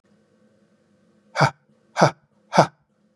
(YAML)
exhalation_length: 3.2 s
exhalation_amplitude: 32395
exhalation_signal_mean_std_ratio: 0.25
survey_phase: beta (2021-08-13 to 2022-03-07)
age: 45-64
gender: Male
wearing_mask: 'No'
symptom_none: true
smoker_status: Never smoked
respiratory_condition_asthma: false
respiratory_condition_other: false
recruitment_source: Test and Trace
submission_delay: 1 day
covid_test_result: Negative
covid_test_method: RT-qPCR